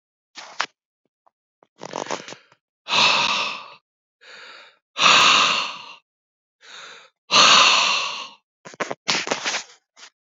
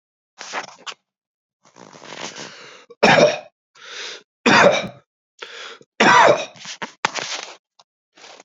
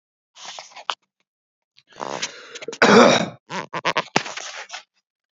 exhalation_length: 10.2 s
exhalation_amplitude: 32767
exhalation_signal_mean_std_ratio: 0.42
three_cough_length: 8.4 s
three_cough_amplitude: 29763
three_cough_signal_mean_std_ratio: 0.36
cough_length: 5.4 s
cough_amplitude: 28714
cough_signal_mean_std_ratio: 0.32
survey_phase: beta (2021-08-13 to 2022-03-07)
age: 45-64
gender: Male
wearing_mask: 'No'
symptom_none: true
symptom_onset: 12 days
smoker_status: Ex-smoker
respiratory_condition_asthma: true
respiratory_condition_other: false
recruitment_source: REACT
submission_delay: 1 day
covid_test_result: Negative
covid_test_method: RT-qPCR
influenza_a_test_result: Unknown/Void
influenza_b_test_result: Unknown/Void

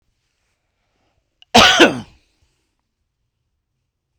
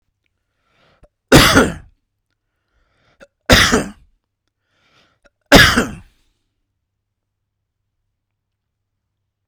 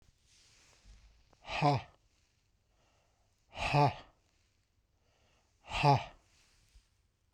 cough_length: 4.2 s
cough_amplitude: 32768
cough_signal_mean_std_ratio: 0.24
three_cough_length: 9.5 s
three_cough_amplitude: 32768
three_cough_signal_mean_std_ratio: 0.26
exhalation_length: 7.3 s
exhalation_amplitude: 6267
exhalation_signal_mean_std_ratio: 0.29
survey_phase: beta (2021-08-13 to 2022-03-07)
age: 45-64
gender: Male
wearing_mask: 'No'
symptom_none: true
smoker_status: Never smoked
respiratory_condition_asthma: false
respiratory_condition_other: false
recruitment_source: REACT
submission_delay: 2 days
covid_test_result: Negative
covid_test_method: RT-qPCR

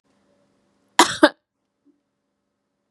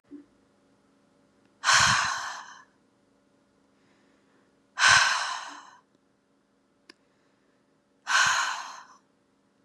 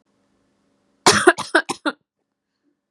cough_length: 2.9 s
cough_amplitude: 32768
cough_signal_mean_std_ratio: 0.18
exhalation_length: 9.6 s
exhalation_amplitude: 16145
exhalation_signal_mean_std_ratio: 0.34
three_cough_length: 2.9 s
three_cough_amplitude: 32767
three_cough_signal_mean_std_ratio: 0.28
survey_phase: beta (2021-08-13 to 2022-03-07)
age: 18-44
gender: Female
wearing_mask: 'No'
symptom_none: true
smoker_status: Never smoked
respiratory_condition_asthma: false
respiratory_condition_other: false
recruitment_source: REACT
submission_delay: 1 day
covid_test_result: Negative
covid_test_method: RT-qPCR
influenza_a_test_result: Negative
influenza_b_test_result: Negative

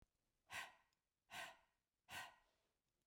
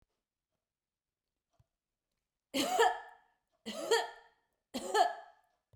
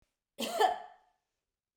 exhalation_length: 3.1 s
exhalation_amplitude: 417
exhalation_signal_mean_std_ratio: 0.39
three_cough_length: 5.8 s
three_cough_amplitude: 6436
three_cough_signal_mean_std_ratio: 0.33
cough_length: 1.8 s
cough_amplitude: 7131
cough_signal_mean_std_ratio: 0.34
survey_phase: beta (2021-08-13 to 2022-03-07)
age: 65+
gender: Female
wearing_mask: 'No'
symptom_none: true
smoker_status: Never smoked
respiratory_condition_asthma: false
respiratory_condition_other: false
recruitment_source: REACT
submission_delay: 2 days
covid_test_result: Negative
covid_test_method: RT-qPCR
influenza_a_test_result: Negative
influenza_b_test_result: Negative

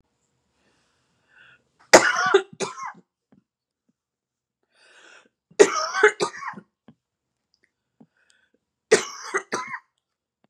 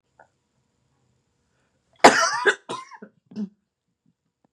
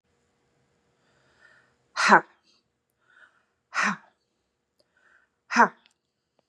three_cough_length: 10.5 s
three_cough_amplitude: 32768
three_cough_signal_mean_std_ratio: 0.25
cough_length: 4.5 s
cough_amplitude: 32768
cough_signal_mean_std_ratio: 0.23
exhalation_length: 6.5 s
exhalation_amplitude: 30757
exhalation_signal_mean_std_ratio: 0.21
survey_phase: beta (2021-08-13 to 2022-03-07)
age: 45-64
gender: Female
wearing_mask: 'No'
symptom_cough_any: true
symptom_fatigue: true
symptom_headache: true
symptom_other: true
symptom_onset: 12 days
smoker_status: Never smoked
respiratory_condition_asthma: false
respiratory_condition_other: false
recruitment_source: REACT
submission_delay: 0 days
covid_test_result: Negative
covid_test_method: RT-qPCR
influenza_a_test_result: Negative
influenza_b_test_result: Negative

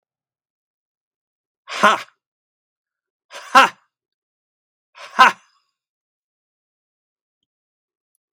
exhalation_length: 8.4 s
exhalation_amplitude: 32767
exhalation_signal_mean_std_ratio: 0.18
survey_phase: beta (2021-08-13 to 2022-03-07)
age: 65+
gender: Male
wearing_mask: 'No'
symptom_none: true
smoker_status: Ex-smoker
respiratory_condition_asthma: false
respiratory_condition_other: false
recruitment_source: REACT
submission_delay: 1 day
covid_test_result: Negative
covid_test_method: RT-qPCR
influenza_a_test_result: Negative
influenza_b_test_result: Negative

